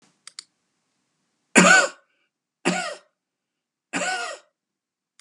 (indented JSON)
{
  "cough_length": "5.2 s",
  "cough_amplitude": 31695,
  "cough_signal_mean_std_ratio": 0.29,
  "survey_phase": "beta (2021-08-13 to 2022-03-07)",
  "age": "65+",
  "gender": "Male",
  "wearing_mask": "No",
  "symptom_none": true,
  "smoker_status": "Never smoked",
  "respiratory_condition_asthma": false,
  "respiratory_condition_other": false,
  "recruitment_source": "REACT",
  "submission_delay": "1 day",
  "covid_test_result": "Negative",
  "covid_test_method": "RT-qPCR",
  "influenza_a_test_result": "Negative",
  "influenza_b_test_result": "Negative"
}